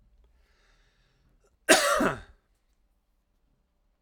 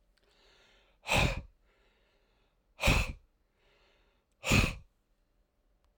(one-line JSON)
{"cough_length": "4.0 s", "cough_amplitude": 25232, "cough_signal_mean_std_ratio": 0.26, "exhalation_length": "6.0 s", "exhalation_amplitude": 7942, "exhalation_signal_mean_std_ratio": 0.31, "survey_phase": "alpha (2021-03-01 to 2021-08-12)", "age": "45-64", "gender": "Male", "wearing_mask": "No", "symptom_none": true, "smoker_status": "Ex-smoker", "respiratory_condition_asthma": false, "respiratory_condition_other": false, "recruitment_source": "REACT", "submission_delay": "5 days", "covid_test_result": "Negative", "covid_test_method": "RT-qPCR"}